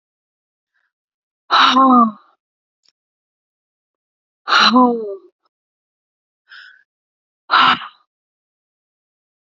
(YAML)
exhalation_length: 9.5 s
exhalation_amplitude: 31098
exhalation_signal_mean_std_ratio: 0.32
survey_phase: beta (2021-08-13 to 2022-03-07)
age: 18-44
gender: Female
wearing_mask: 'No'
symptom_none: true
symptom_onset: 11 days
smoker_status: Never smoked
respiratory_condition_asthma: false
respiratory_condition_other: false
recruitment_source: REACT
submission_delay: -1 day
covid_test_result: Negative
covid_test_method: RT-qPCR
influenza_a_test_result: Negative
influenza_b_test_result: Negative